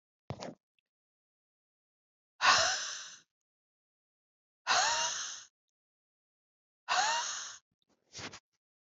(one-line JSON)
{"exhalation_length": "9.0 s", "exhalation_amplitude": 9670, "exhalation_signal_mean_std_ratio": 0.35, "survey_phase": "beta (2021-08-13 to 2022-03-07)", "age": "45-64", "gender": "Female", "wearing_mask": "No", "symptom_runny_or_blocked_nose": true, "smoker_status": "Never smoked", "respiratory_condition_asthma": false, "respiratory_condition_other": false, "recruitment_source": "Test and Trace", "submission_delay": "2 days", "covid_test_result": "Positive", "covid_test_method": "RT-qPCR", "covid_ct_value": 21.1, "covid_ct_gene": "ORF1ab gene", "covid_ct_mean": 21.7, "covid_viral_load": "78000 copies/ml", "covid_viral_load_category": "Low viral load (10K-1M copies/ml)"}